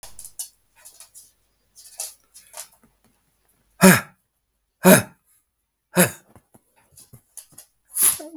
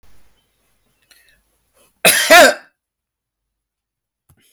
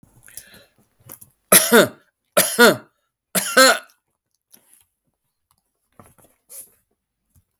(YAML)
exhalation_length: 8.4 s
exhalation_amplitude: 32766
exhalation_signal_mean_std_ratio: 0.24
cough_length: 4.5 s
cough_amplitude: 32768
cough_signal_mean_std_ratio: 0.26
three_cough_length: 7.6 s
three_cough_amplitude: 32768
three_cough_signal_mean_std_ratio: 0.28
survey_phase: beta (2021-08-13 to 2022-03-07)
age: 65+
gender: Male
wearing_mask: 'No'
symptom_none: true
smoker_status: Never smoked
respiratory_condition_asthma: false
respiratory_condition_other: false
recruitment_source: REACT
submission_delay: 1 day
covid_test_result: Negative
covid_test_method: RT-qPCR